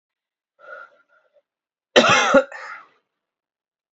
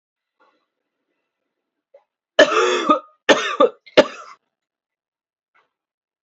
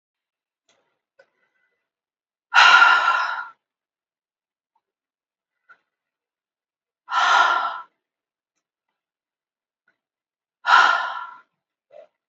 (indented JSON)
{
  "cough_length": "3.9 s",
  "cough_amplitude": 28066,
  "cough_signal_mean_std_ratio": 0.29,
  "three_cough_length": "6.2 s",
  "three_cough_amplitude": 29289,
  "three_cough_signal_mean_std_ratio": 0.28,
  "exhalation_length": "12.3 s",
  "exhalation_amplitude": 32767,
  "exhalation_signal_mean_std_ratio": 0.3,
  "survey_phase": "beta (2021-08-13 to 2022-03-07)",
  "age": "18-44",
  "gender": "Female",
  "wearing_mask": "No",
  "symptom_runny_or_blocked_nose": true,
  "symptom_change_to_sense_of_smell_or_taste": true,
  "symptom_loss_of_taste": true,
  "symptom_onset": "2 days",
  "smoker_status": "Ex-smoker",
  "respiratory_condition_asthma": false,
  "respiratory_condition_other": false,
  "recruitment_source": "Test and Trace",
  "submission_delay": "2 days",
  "covid_test_result": "Positive",
  "covid_test_method": "ePCR"
}